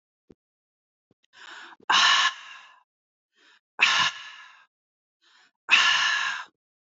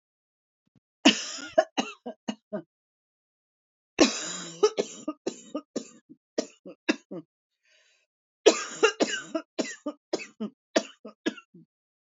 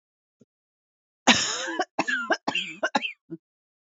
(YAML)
exhalation_length: 6.8 s
exhalation_amplitude: 18843
exhalation_signal_mean_std_ratio: 0.39
three_cough_length: 12.0 s
three_cough_amplitude: 21415
three_cough_signal_mean_std_ratio: 0.3
cough_length: 3.9 s
cough_amplitude: 25969
cough_signal_mean_std_ratio: 0.4
survey_phase: beta (2021-08-13 to 2022-03-07)
age: 45-64
gender: Female
wearing_mask: 'No'
symptom_fatigue: true
smoker_status: Ex-smoker
respiratory_condition_asthma: false
respiratory_condition_other: false
recruitment_source: REACT
submission_delay: 1 day
covid_test_result: Negative
covid_test_method: RT-qPCR
influenza_a_test_result: Negative
influenza_b_test_result: Negative